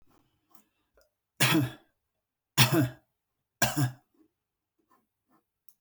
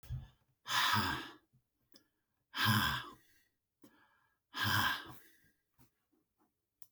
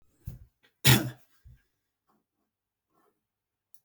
{
  "three_cough_length": "5.8 s",
  "three_cough_amplitude": 14482,
  "three_cough_signal_mean_std_ratio": 0.3,
  "exhalation_length": "6.9 s",
  "exhalation_amplitude": 3758,
  "exhalation_signal_mean_std_ratio": 0.41,
  "cough_length": "3.8 s",
  "cough_amplitude": 16981,
  "cough_signal_mean_std_ratio": 0.19,
  "survey_phase": "beta (2021-08-13 to 2022-03-07)",
  "age": "45-64",
  "gender": "Male",
  "wearing_mask": "No",
  "symptom_headache": true,
  "smoker_status": "Never smoked",
  "respiratory_condition_asthma": false,
  "respiratory_condition_other": false,
  "recruitment_source": "REACT",
  "submission_delay": "0 days",
  "covid_test_result": "Positive",
  "covid_test_method": "RT-qPCR",
  "covid_ct_value": 22.0,
  "covid_ct_gene": "E gene"
}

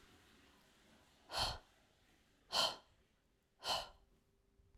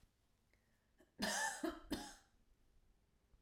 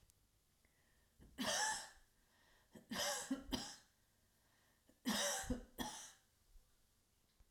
{
  "exhalation_length": "4.8 s",
  "exhalation_amplitude": 2822,
  "exhalation_signal_mean_std_ratio": 0.33,
  "cough_length": "3.4 s",
  "cough_amplitude": 1394,
  "cough_signal_mean_std_ratio": 0.4,
  "three_cough_length": "7.5 s",
  "three_cough_amplitude": 1392,
  "three_cough_signal_mean_std_ratio": 0.44,
  "survey_phase": "alpha (2021-03-01 to 2021-08-12)",
  "age": "45-64",
  "gender": "Female",
  "wearing_mask": "No",
  "symptom_none": true,
  "smoker_status": "Never smoked",
  "respiratory_condition_asthma": false,
  "respiratory_condition_other": false,
  "recruitment_source": "REACT",
  "submission_delay": "2 days",
  "covid_test_result": "Negative",
  "covid_test_method": "RT-qPCR"
}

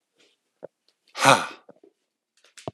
{
  "exhalation_length": "2.7 s",
  "exhalation_amplitude": 32136,
  "exhalation_signal_mean_std_ratio": 0.22,
  "survey_phase": "alpha (2021-03-01 to 2021-08-12)",
  "age": "45-64",
  "gender": "Male",
  "wearing_mask": "Yes",
  "symptom_cough_any": true,
  "symptom_shortness_of_breath": true,
  "symptom_fatigue": true,
  "symptom_headache": true,
  "symptom_onset": "3 days",
  "smoker_status": "Ex-smoker",
  "respiratory_condition_asthma": false,
  "respiratory_condition_other": true,
  "recruitment_source": "Test and Trace",
  "submission_delay": "2 days",
  "covid_test_result": "Positive",
  "covid_test_method": "RT-qPCR",
  "covid_ct_value": 17.1,
  "covid_ct_gene": "ORF1ab gene",
  "covid_ct_mean": 17.3,
  "covid_viral_load": "2100000 copies/ml",
  "covid_viral_load_category": "High viral load (>1M copies/ml)"
}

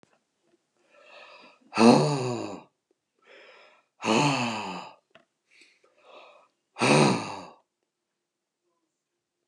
{
  "exhalation_length": "9.5 s",
  "exhalation_amplitude": 21449,
  "exhalation_signal_mean_std_ratio": 0.33,
  "survey_phase": "beta (2021-08-13 to 2022-03-07)",
  "age": "65+",
  "gender": "Male",
  "wearing_mask": "No",
  "symptom_cough_any": true,
  "symptom_runny_or_blocked_nose": true,
  "symptom_fatigue": true,
  "smoker_status": "Never smoked",
  "respiratory_condition_asthma": false,
  "respiratory_condition_other": false,
  "recruitment_source": "Test and Trace",
  "submission_delay": "2 days",
  "covid_test_result": "Positive",
  "covid_test_method": "ePCR"
}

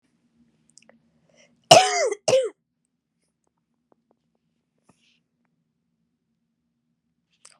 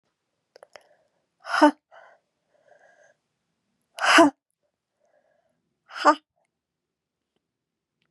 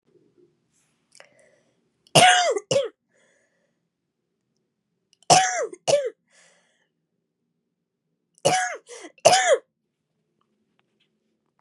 {
  "cough_length": "7.6 s",
  "cough_amplitude": 32768,
  "cough_signal_mean_std_ratio": 0.19,
  "exhalation_length": "8.1 s",
  "exhalation_amplitude": 25710,
  "exhalation_signal_mean_std_ratio": 0.21,
  "three_cough_length": "11.6 s",
  "three_cough_amplitude": 30956,
  "three_cough_signal_mean_std_ratio": 0.29,
  "survey_phase": "beta (2021-08-13 to 2022-03-07)",
  "age": "18-44",
  "gender": "Female",
  "wearing_mask": "No",
  "symptom_cough_any": true,
  "symptom_runny_or_blocked_nose": true,
  "symptom_sore_throat": true,
  "symptom_fatigue": true,
  "symptom_headache": true,
  "smoker_status": "Never smoked",
  "respiratory_condition_asthma": false,
  "respiratory_condition_other": false,
  "recruitment_source": "Test and Trace",
  "submission_delay": "2 days",
  "covid_test_result": "Positive",
  "covid_test_method": "RT-qPCR",
  "covid_ct_value": 13.9,
  "covid_ct_gene": "ORF1ab gene"
}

